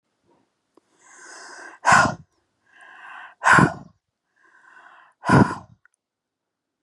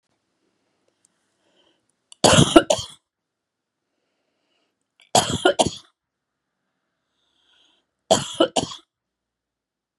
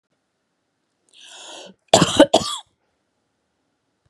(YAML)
exhalation_length: 6.8 s
exhalation_amplitude: 28638
exhalation_signal_mean_std_ratio: 0.29
three_cough_length: 10.0 s
three_cough_amplitude: 32768
three_cough_signal_mean_std_ratio: 0.24
cough_length: 4.1 s
cough_amplitude: 32768
cough_signal_mean_std_ratio: 0.24
survey_phase: beta (2021-08-13 to 2022-03-07)
age: 45-64
gender: Female
wearing_mask: 'No'
symptom_fatigue: true
smoker_status: Never smoked
respiratory_condition_asthma: false
respiratory_condition_other: false
recruitment_source: REACT
submission_delay: 1 day
covid_test_result: Negative
covid_test_method: RT-qPCR
influenza_a_test_result: Negative
influenza_b_test_result: Negative